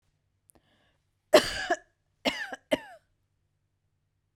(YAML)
three_cough_length: 4.4 s
three_cough_amplitude: 17742
three_cough_signal_mean_std_ratio: 0.23
survey_phase: beta (2021-08-13 to 2022-03-07)
age: 18-44
gender: Female
wearing_mask: 'No'
symptom_none: true
smoker_status: Ex-smoker
respiratory_condition_asthma: false
respiratory_condition_other: false
recruitment_source: REACT
submission_delay: 2 days
covid_test_result: Negative
covid_test_method: RT-qPCR